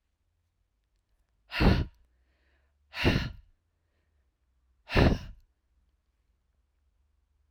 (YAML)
exhalation_length: 7.5 s
exhalation_amplitude: 12908
exhalation_signal_mean_std_ratio: 0.27
survey_phase: alpha (2021-03-01 to 2021-08-12)
age: 45-64
gender: Female
wearing_mask: 'No'
symptom_none: true
symptom_onset: 4 days
smoker_status: Ex-smoker
respiratory_condition_asthma: false
respiratory_condition_other: false
recruitment_source: REACT
submission_delay: 1 day
covid_test_result: Negative
covid_test_method: RT-qPCR